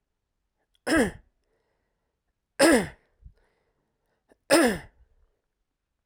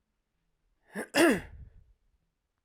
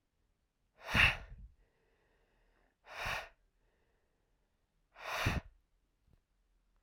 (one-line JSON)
{"three_cough_length": "6.1 s", "three_cough_amplitude": 18451, "three_cough_signal_mean_std_ratio": 0.28, "cough_length": "2.6 s", "cough_amplitude": 10171, "cough_signal_mean_std_ratio": 0.28, "exhalation_length": "6.8 s", "exhalation_amplitude": 6737, "exhalation_signal_mean_std_ratio": 0.27, "survey_phase": "alpha (2021-03-01 to 2021-08-12)", "age": "18-44", "gender": "Male", "wearing_mask": "No", "symptom_none": true, "smoker_status": "Never smoked", "respiratory_condition_asthma": true, "respiratory_condition_other": false, "recruitment_source": "REACT", "submission_delay": "2 days", "covid_test_result": "Negative", "covid_test_method": "RT-qPCR"}